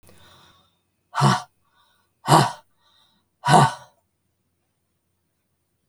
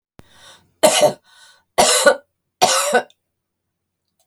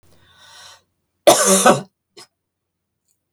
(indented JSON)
{
  "exhalation_length": "5.9 s",
  "exhalation_amplitude": 32768,
  "exhalation_signal_mean_std_ratio": 0.27,
  "three_cough_length": "4.3 s",
  "three_cough_amplitude": 32768,
  "three_cough_signal_mean_std_ratio": 0.4,
  "cough_length": "3.3 s",
  "cough_amplitude": 32768,
  "cough_signal_mean_std_ratio": 0.31,
  "survey_phase": "beta (2021-08-13 to 2022-03-07)",
  "age": "65+",
  "gender": "Female",
  "wearing_mask": "No",
  "symptom_none": true,
  "smoker_status": "Never smoked",
  "respiratory_condition_asthma": false,
  "respiratory_condition_other": false,
  "recruitment_source": "REACT",
  "submission_delay": "1 day",
  "covid_test_result": "Negative",
  "covid_test_method": "RT-qPCR",
  "influenza_a_test_result": "Negative",
  "influenza_b_test_result": "Negative"
}